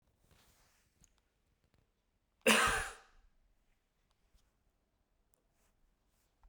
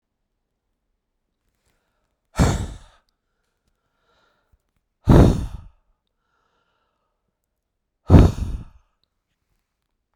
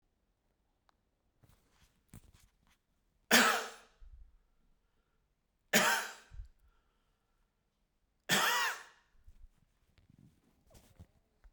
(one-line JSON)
{"cough_length": "6.5 s", "cough_amplitude": 10423, "cough_signal_mean_std_ratio": 0.21, "exhalation_length": "10.2 s", "exhalation_amplitude": 32768, "exhalation_signal_mean_std_ratio": 0.23, "three_cough_length": "11.5 s", "three_cough_amplitude": 10516, "three_cough_signal_mean_std_ratio": 0.26, "survey_phase": "beta (2021-08-13 to 2022-03-07)", "age": "65+", "gender": "Male", "wearing_mask": "No", "symptom_none": true, "symptom_onset": "13 days", "smoker_status": "Never smoked", "respiratory_condition_asthma": false, "respiratory_condition_other": false, "recruitment_source": "REACT", "submission_delay": "2 days", "covid_test_result": "Negative", "covid_test_method": "RT-qPCR"}